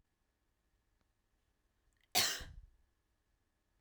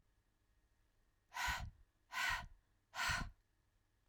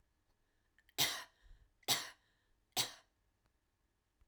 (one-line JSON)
{"cough_length": "3.8 s", "cough_amplitude": 5046, "cough_signal_mean_std_ratio": 0.22, "exhalation_length": "4.1 s", "exhalation_amplitude": 1426, "exhalation_signal_mean_std_ratio": 0.43, "three_cough_length": "4.3 s", "three_cough_amplitude": 4069, "three_cough_signal_mean_std_ratio": 0.27, "survey_phase": "beta (2021-08-13 to 2022-03-07)", "age": "18-44", "gender": "Female", "wearing_mask": "No", "symptom_cough_any": true, "smoker_status": "Never smoked", "respiratory_condition_asthma": false, "respiratory_condition_other": false, "recruitment_source": "REACT", "submission_delay": "2 days", "covid_test_result": "Negative", "covid_test_method": "RT-qPCR", "influenza_a_test_result": "Unknown/Void", "influenza_b_test_result": "Unknown/Void"}